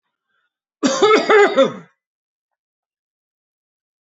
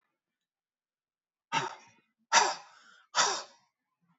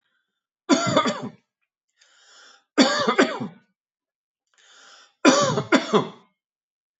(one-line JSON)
{"cough_length": "4.0 s", "cough_amplitude": 28952, "cough_signal_mean_std_ratio": 0.36, "exhalation_length": "4.2 s", "exhalation_amplitude": 11782, "exhalation_signal_mean_std_ratio": 0.29, "three_cough_length": "7.0 s", "three_cough_amplitude": 26272, "three_cough_signal_mean_std_ratio": 0.38, "survey_phase": "beta (2021-08-13 to 2022-03-07)", "age": "45-64", "gender": "Male", "wearing_mask": "No", "symptom_none": true, "smoker_status": "Never smoked", "respiratory_condition_asthma": true, "respiratory_condition_other": false, "recruitment_source": "REACT", "submission_delay": "2 days", "covid_test_result": "Negative", "covid_test_method": "RT-qPCR"}